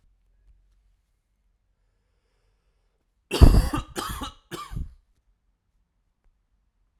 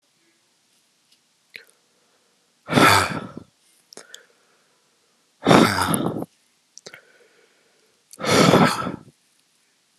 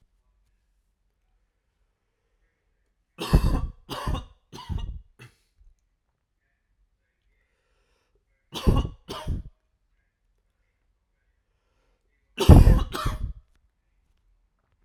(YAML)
cough_length: 7.0 s
cough_amplitude: 32768
cough_signal_mean_std_ratio: 0.2
exhalation_length: 10.0 s
exhalation_amplitude: 32768
exhalation_signal_mean_std_ratio: 0.33
three_cough_length: 14.8 s
three_cough_amplitude: 32768
three_cough_signal_mean_std_ratio: 0.23
survey_phase: alpha (2021-03-01 to 2021-08-12)
age: 18-44
gender: Male
wearing_mask: 'No'
symptom_cough_any: true
symptom_fatigue: true
symptom_headache: true
symptom_onset: 3 days
smoker_status: Never smoked
respiratory_condition_asthma: false
respiratory_condition_other: false
recruitment_source: Test and Trace
submission_delay: 2 days
covid_test_result: Positive
covid_test_method: RT-qPCR
covid_ct_value: 24.8
covid_ct_gene: ORF1ab gene
covid_ct_mean: 25.5
covid_viral_load: 4400 copies/ml
covid_viral_load_category: Minimal viral load (< 10K copies/ml)